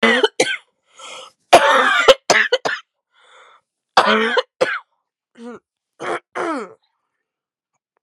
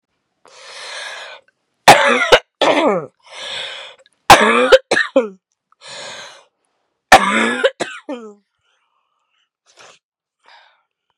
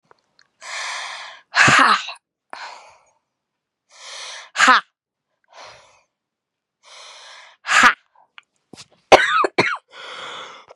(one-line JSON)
{"cough_length": "8.0 s", "cough_amplitude": 32768, "cough_signal_mean_std_ratio": 0.4, "three_cough_length": "11.2 s", "three_cough_amplitude": 32768, "three_cough_signal_mean_std_ratio": 0.35, "exhalation_length": "10.8 s", "exhalation_amplitude": 32768, "exhalation_signal_mean_std_ratio": 0.32, "survey_phase": "beta (2021-08-13 to 2022-03-07)", "age": "18-44", "gender": "Female", "wearing_mask": "No", "symptom_cough_any": true, "symptom_runny_or_blocked_nose": true, "symptom_shortness_of_breath": true, "symptom_sore_throat": true, "symptom_diarrhoea": true, "symptom_fatigue": true, "symptom_fever_high_temperature": true, "symptom_headache": true, "symptom_change_to_sense_of_smell_or_taste": true, "symptom_onset": "4 days", "smoker_status": "Never smoked", "respiratory_condition_asthma": false, "respiratory_condition_other": false, "recruitment_source": "Test and Trace", "submission_delay": "1 day", "covid_test_result": "Positive", "covid_test_method": "RT-qPCR", "covid_ct_value": 23.5, "covid_ct_gene": "ORF1ab gene", "covid_ct_mean": 23.6, "covid_viral_load": "19000 copies/ml", "covid_viral_load_category": "Low viral load (10K-1M copies/ml)"}